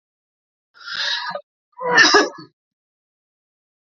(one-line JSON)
{"cough_length": "3.9 s", "cough_amplitude": 29250, "cough_signal_mean_std_ratio": 0.34, "survey_phase": "beta (2021-08-13 to 2022-03-07)", "age": "45-64", "gender": "Male", "wearing_mask": "No", "symptom_none": true, "smoker_status": "Never smoked", "respiratory_condition_asthma": false, "respiratory_condition_other": false, "recruitment_source": "REACT", "submission_delay": "0 days", "covid_test_result": "Negative", "covid_test_method": "RT-qPCR", "influenza_a_test_result": "Negative", "influenza_b_test_result": "Negative"}